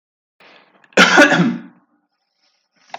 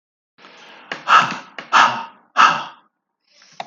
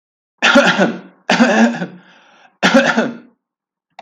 {"cough_length": "3.0 s", "cough_amplitude": 32768, "cough_signal_mean_std_ratio": 0.36, "exhalation_length": "3.7 s", "exhalation_amplitude": 32768, "exhalation_signal_mean_std_ratio": 0.37, "three_cough_length": "4.0 s", "three_cough_amplitude": 32768, "three_cough_signal_mean_std_ratio": 0.52, "survey_phase": "beta (2021-08-13 to 2022-03-07)", "age": "18-44", "gender": "Male", "wearing_mask": "No", "symptom_sore_throat": true, "symptom_onset": "13 days", "smoker_status": "Never smoked", "respiratory_condition_asthma": false, "respiratory_condition_other": false, "recruitment_source": "REACT", "submission_delay": "1 day", "covid_test_result": "Negative", "covid_test_method": "RT-qPCR", "influenza_a_test_result": "Negative", "influenza_b_test_result": "Negative"}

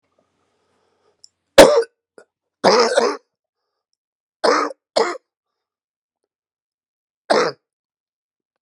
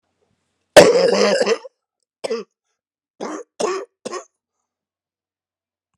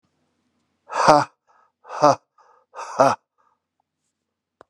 {"three_cough_length": "8.6 s", "three_cough_amplitude": 32768, "three_cough_signal_mean_std_ratio": 0.28, "cough_length": "6.0 s", "cough_amplitude": 32768, "cough_signal_mean_std_ratio": 0.32, "exhalation_length": "4.7 s", "exhalation_amplitude": 32767, "exhalation_signal_mean_std_ratio": 0.27, "survey_phase": "beta (2021-08-13 to 2022-03-07)", "age": "65+", "gender": "Male", "wearing_mask": "No", "symptom_cough_any": true, "symptom_new_continuous_cough": true, "symptom_runny_or_blocked_nose": true, "symptom_shortness_of_breath": true, "symptom_sore_throat": true, "symptom_abdominal_pain": true, "symptom_fatigue": true, "symptom_fever_high_temperature": true, "symptom_headache": true, "smoker_status": "Never smoked", "respiratory_condition_asthma": false, "respiratory_condition_other": false, "recruitment_source": "Test and Trace", "submission_delay": "1 day", "covid_test_result": "Positive", "covid_test_method": "LFT"}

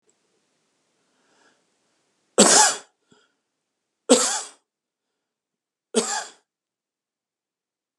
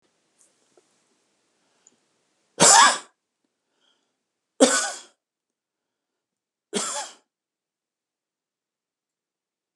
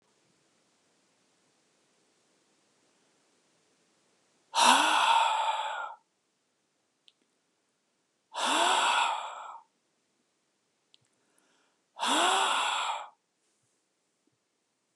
{"cough_length": "8.0 s", "cough_amplitude": 30883, "cough_signal_mean_std_ratio": 0.24, "three_cough_length": "9.8 s", "three_cough_amplitude": 29506, "three_cough_signal_mean_std_ratio": 0.21, "exhalation_length": "15.0 s", "exhalation_amplitude": 12798, "exhalation_signal_mean_std_ratio": 0.38, "survey_phase": "alpha (2021-03-01 to 2021-08-12)", "age": "65+", "gender": "Male", "wearing_mask": "No", "symptom_none": true, "smoker_status": "Ex-smoker", "respiratory_condition_asthma": false, "respiratory_condition_other": false, "recruitment_source": "REACT", "submission_delay": "1 day", "covid_test_result": "Negative", "covid_test_method": "RT-qPCR"}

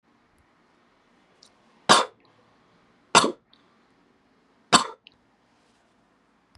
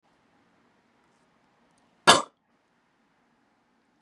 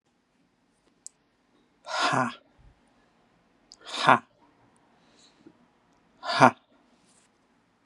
{"three_cough_length": "6.6 s", "three_cough_amplitude": 29867, "three_cough_signal_mean_std_ratio": 0.19, "cough_length": "4.0 s", "cough_amplitude": 29795, "cough_signal_mean_std_ratio": 0.14, "exhalation_length": "7.9 s", "exhalation_amplitude": 29895, "exhalation_signal_mean_std_ratio": 0.22, "survey_phase": "beta (2021-08-13 to 2022-03-07)", "age": "18-44", "gender": "Male", "wearing_mask": "No", "symptom_none": true, "smoker_status": "Ex-smoker", "respiratory_condition_asthma": false, "respiratory_condition_other": false, "recruitment_source": "REACT", "submission_delay": "3 days", "covid_test_result": "Negative", "covid_test_method": "RT-qPCR", "influenza_a_test_result": "Negative", "influenza_b_test_result": "Negative"}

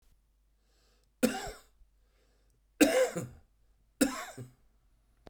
{"three_cough_length": "5.3 s", "three_cough_amplitude": 10977, "three_cough_signal_mean_std_ratio": 0.3, "survey_phase": "beta (2021-08-13 to 2022-03-07)", "age": "65+", "gender": "Male", "wearing_mask": "No", "symptom_cough_any": true, "symptom_runny_or_blocked_nose": true, "symptom_onset": "9 days", "smoker_status": "Ex-smoker", "respiratory_condition_asthma": false, "respiratory_condition_other": true, "recruitment_source": "REACT", "submission_delay": "2 days", "covid_test_result": "Negative", "covid_test_method": "RT-qPCR"}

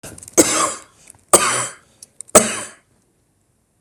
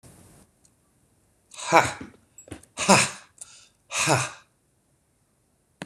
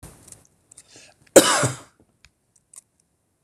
{"three_cough_length": "3.8 s", "three_cough_amplitude": 26028, "three_cough_signal_mean_std_ratio": 0.35, "exhalation_length": "5.9 s", "exhalation_amplitude": 26028, "exhalation_signal_mean_std_ratio": 0.29, "cough_length": "3.4 s", "cough_amplitude": 26028, "cough_signal_mean_std_ratio": 0.23, "survey_phase": "beta (2021-08-13 to 2022-03-07)", "age": "45-64", "gender": "Male", "wearing_mask": "No", "symptom_none": true, "smoker_status": "Ex-smoker", "respiratory_condition_asthma": false, "respiratory_condition_other": false, "recruitment_source": "REACT", "submission_delay": "2 days", "covid_test_result": "Negative", "covid_test_method": "RT-qPCR"}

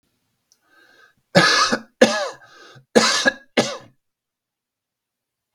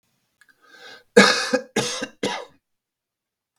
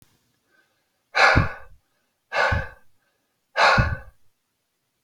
{"three_cough_length": "5.5 s", "three_cough_amplitude": 32768, "three_cough_signal_mean_std_ratio": 0.35, "cough_length": "3.6 s", "cough_amplitude": 32768, "cough_signal_mean_std_ratio": 0.31, "exhalation_length": "5.0 s", "exhalation_amplitude": 25099, "exhalation_signal_mean_std_ratio": 0.37, "survey_phase": "beta (2021-08-13 to 2022-03-07)", "age": "45-64", "gender": "Male", "wearing_mask": "No", "symptom_cough_any": true, "symptom_runny_or_blocked_nose": true, "symptom_headache": true, "symptom_change_to_sense_of_smell_or_taste": true, "symptom_onset": "12 days", "smoker_status": "Never smoked", "respiratory_condition_asthma": false, "respiratory_condition_other": false, "recruitment_source": "REACT", "submission_delay": "2 days", "covid_test_result": "Negative", "covid_test_method": "RT-qPCR"}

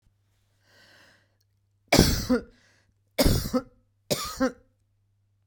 {"three_cough_length": "5.5 s", "three_cough_amplitude": 29753, "three_cough_signal_mean_std_ratio": 0.33, "survey_phase": "beta (2021-08-13 to 2022-03-07)", "age": "45-64", "gender": "Female", "wearing_mask": "No", "symptom_none": true, "symptom_onset": "8 days", "smoker_status": "Ex-smoker", "respiratory_condition_asthma": false, "respiratory_condition_other": false, "recruitment_source": "REACT", "submission_delay": "1 day", "covid_test_result": "Negative", "covid_test_method": "RT-qPCR"}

